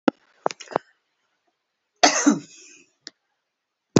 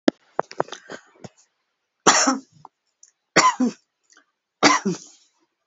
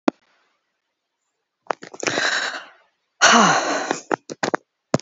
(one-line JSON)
{"cough_length": "4.0 s", "cough_amplitude": 31710, "cough_signal_mean_std_ratio": 0.23, "three_cough_length": "5.7 s", "three_cough_amplitude": 32767, "three_cough_signal_mean_std_ratio": 0.32, "exhalation_length": "5.0 s", "exhalation_amplitude": 32106, "exhalation_signal_mean_std_ratio": 0.38, "survey_phase": "beta (2021-08-13 to 2022-03-07)", "age": "65+", "gender": "Female", "wearing_mask": "No", "symptom_none": true, "smoker_status": "Never smoked", "respiratory_condition_asthma": false, "respiratory_condition_other": false, "recruitment_source": "REACT", "submission_delay": "1 day", "covid_test_result": "Negative", "covid_test_method": "RT-qPCR"}